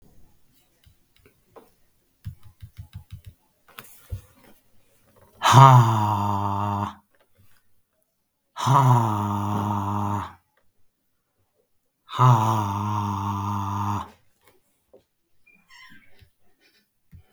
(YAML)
exhalation_length: 17.3 s
exhalation_amplitude: 32766
exhalation_signal_mean_std_ratio: 0.38
survey_phase: beta (2021-08-13 to 2022-03-07)
age: 45-64
gender: Male
wearing_mask: 'No'
symptom_none: true
smoker_status: Never smoked
respiratory_condition_asthma: false
respiratory_condition_other: true
recruitment_source: REACT
submission_delay: 1 day
covid_test_result: Negative
covid_test_method: RT-qPCR
influenza_a_test_result: Negative
influenza_b_test_result: Negative